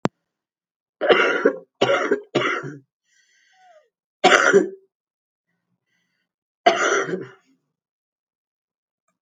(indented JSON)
{
  "three_cough_length": "9.2 s",
  "three_cough_amplitude": 32768,
  "three_cough_signal_mean_std_ratio": 0.36,
  "survey_phase": "alpha (2021-03-01 to 2021-08-12)",
  "age": "45-64",
  "gender": "Female",
  "wearing_mask": "No",
  "symptom_cough_any": true,
  "symptom_fatigue": true,
  "symptom_headache": true,
  "symptom_onset": "12 days",
  "smoker_status": "Current smoker (11 or more cigarettes per day)",
  "respiratory_condition_asthma": true,
  "respiratory_condition_other": false,
  "recruitment_source": "REACT",
  "submission_delay": "2 days",
  "covid_test_result": "Negative",
  "covid_test_method": "RT-qPCR"
}